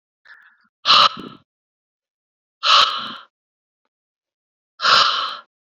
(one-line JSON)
{"exhalation_length": "5.7 s", "exhalation_amplitude": 29408, "exhalation_signal_mean_std_ratio": 0.35, "survey_phase": "beta (2021-08-13 to 2022-03-07)", "age": "18-44", "gender": "Male", "wearing_mask": "No", "symptom_cough_any": true, "symptom_runny_or_blocked_nose": true, "symptom_headache": true, "symptom_change_to_sense_of_smell_or_taste": true, "symptom_loss_of_taste": true, "symptom_onset": "4 days", "smoker_status": "Current smoker (e-cigarettes or vapes only)", "respiratory_condition_asthma": false, "respiratory_condition_other": false, "recruitment_source": "Test and Trace", "submission_delay": "2 days", "covid_test_result": "Positive", "covid_test_method": "RT-qPCR", "covid_ct_value": 17.6, "covid_ct_gene": "ORF1ab gene", "covid_ct_mean": 18.4, "covid_viral_load": "920000 copies/ml", "covid_viral_load_category": "Low viral load (10K-1M copies/ml)"}